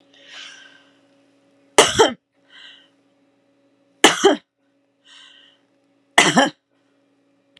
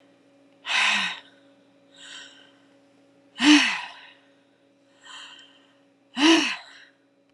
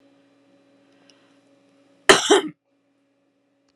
{"three_cough_length": "7.6 s", "three_cough_amplitude": 32768, "three_cough_signal_mean_std_ratio": 0.26, "exhalation_length": "7.3 s", "exhalation_amplitude": 24136, "exhalation_signal_mean_std_ratio": 0.34, "cough_length": "3.8 s", "cough_amplitude": 32768, "cough_signal_mean_std_ratio": 0.21, "survey_phase": "alpha (2021-03-01 to 2021-08-12)", "age": "65+", "gender": "Female", "wearing_mask": "No", "symptom_none": true, "smoker_status": "Never smoked", "respiratory_condition_asthma": false, "respiratory_condition_other": false, "recruitment_source": "REACT", "submission_delay": "9 days", "covid_test_result": "Negative", "covid_test_method": "RT-qPCR"}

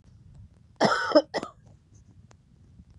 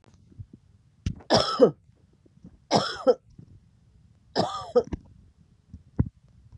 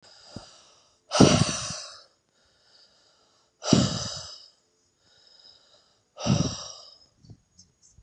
{"cough_length": "3.0 s", "cough_amplitude": 16322, "cough_signal_mean_std_ratio": 0.32, "three_cough_length": "6.6 s", "three_cough_amplitude": 19515, "three_cough_signal_mean_std_ratio": 0.32, "exhalation_length": "8.0 s", "exhalation_amplitude": 30638, "exhalation_signal_mean_std_ratio": 0.3, "survey_phase": "beta (2021-08-13 to 2022-03-07)", "age": "45-64", "gender": "Female", "wearing_mask": "No", "symptom_new_continuous_cough": true, "symptom_runny_or_blocked_nose": true, "symptom_shortness_of_breath": true, "symptom_sore_throat": true, "symptom_abdominal_pain": true, "symptom_fatigue": true, "symptom_fever_high_temperature": true, "symptom_headache": true, "symptom_change_to_sense_of_smell_or_taste": true, "smoker_status": "Never smoked", "respiratory_condition_asthma": false, "respiratory_condition_other": false, "recruitment_source": "Test and Trace", "submission_delay": "2 days", "covid_test_result": "Positive", "covid_test_method": "ePCR"}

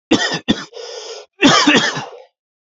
{"cough_length": "2.7 s", "cough_amplitude": 29363, "cough_signal_mean_std_ratio": 0.52, "survey_phase": "alpha (2021-03-01 to 2021-08-12)", "age": "18-44", "gender": "Male", "wearing_mask": "No", "symptom_cough_any": true, "symptom_shortness_of_breath": true, "symptom_fatigue": true, "symptom_headache": true, "symptom_change_to_sense_of_smell_or_taste": true, "symptom_onset": "3 days", "smoker_status": "Never smoked", "respiratory_condition_asthma": false, "respiratory_condition_other": false, "recruitment_source": "Test and Trace", "submission_delay": "1 day", "covid_test_result": "Positive", "covid_test_method": "RT-qPCR", "covid_ct_value": 18.8, "covid_ct_gene": "ORF1ab gene", "covid_ct_mean": 19.6, "covid_viral_load": "370000 copies/ml", "covid_viral_load_category": "Low viral load (10K-1M copies/ml)"}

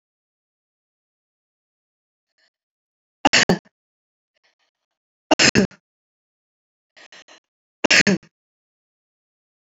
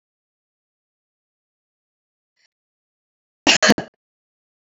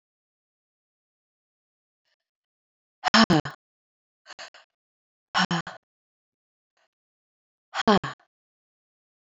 {"three_cough_length": "9.7 s", "three_cough_amplitude": 30858, "three_cough_signal_mean_std_ratio": 0.2, "cough_length": "4.7 s", "cough_amplitude": 28370, "cough_signal_mean_std_ratio": 0.17, "exhalation_length": "9.2 s", "exhalation_amplitude": 19694, "exhalation_signal_mean_std_ratio": 0.2, "survey_phase": "beta (2021-08-13 to 2022-03-07)", "age": "45-64", "gender": "Female", "wearing_mask": "No", "symptom_runny_or_blocked_nose": true, "smoker_status": "Current smoker (1 to 10 cigarettes per day)", "respiratory_condition_asthma": false, "respiratory_condition_other": false, "recruitment_source": "REACT", "submission_delay": "2 days", "covid_test_result": "Negative", "covid_test_method": "RT-qPCR"}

